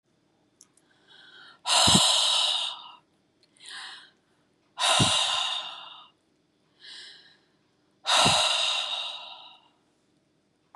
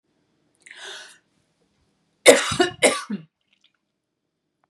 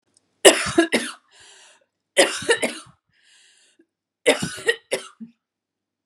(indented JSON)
{
  "exhalation_length": "10.8 s",
  "exhalation_amplitude": 19783,
  "exhalation_signal_mean_std_ratio": 0.45,
  "cough_length": "4.7 s",
  "cough_amplitude": 32768,
  "cough_signal_mean_std_ratio": 0.25,
  "three_cough_length": "6.1 s",
  "three_cough_amplitude": 32768,
  "three_cough_signal_mean_std_ratio": 0.32,
  "survey_phase": "beta (2021-08-13 to 2022-03-07)",
  "age": "45-64",
  "gender": "Female",
  "wearing_mask": "No",
  "symptom_none": true,
  "smoker_status": "Never smoked",
  "respiratory_condition_asthma": false,
  "respiratory_condition_other": false,
  "recruitment_source": "Test and Trace",
  "submission_delay": "4 days",
  "covid_test_result": "Negative",
  "covid_test_method": "RT-qPCR"
}